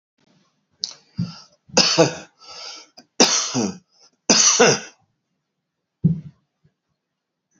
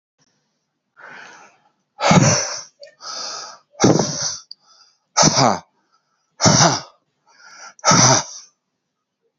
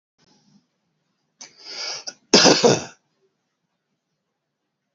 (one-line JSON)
{"three_cough_length": "7.6 s", "three_cough_amplitude": 32767, "three_cough_signal_mean_std_ratio": 0.36, "exhalation_length": "9.4 s", "exhalation_amplitude": 32603, "exhalation_signal_mean_std_ratio": 0.4, "cough_length": "4.9 s", "cough_amplitude": 29273, "cough_signal_mean_std_ratio": 0.26, "survey_phase": "beta (2021-08-13 to 2022-03-07)", "age": "18-44", "gender": "Female", "wearing_mask": "No", "symptom_runny_or_blocked_nose": true, "symptom_shortness_of_breath": true, "symptom_fatigue": true, "symptom_headache": true, "smoker_status": "Current smoker (1 to 10 cigarettes per day)", "respiratory_condition_asthma": false, "respiratory_condition_other": false, "recruitment_source": "Test and Trace", "submission_delay": "4 days", "covid_test_result": "Positive", "covid_test_method": "LFT"}